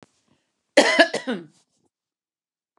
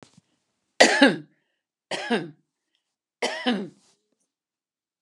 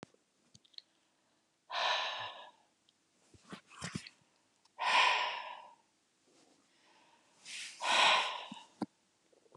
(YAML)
cough_length: 2.8 s
cough_amplitude: 31823
cough_signal_mean_std_ratio: 0.28
three_cough_length: 5.0 s
three_cough_amplitude: 32767
three_cough_signal_mean_std_ratio: 0.29
exhalation_length: 9.6 s
exhalation_amplitude: 5864
exhalation_signal_mean_std_ratio: 0.37
survey_phase: beta (2021-08-13 to 2022-03-07)
age: 65+
gender: Female
wearing_mask: 'No'
symptom_none: true
smoker_status: Never smoked
respiratory_condition_asthma: false
respiratory_condition_other: false
recruitment_source: REACT
submission_delay: 3 days
covid_test_result: Negative
covid_test_method: RT-qPCR
influenza_a_test_result: Negative
influenza_b_test_result: Negative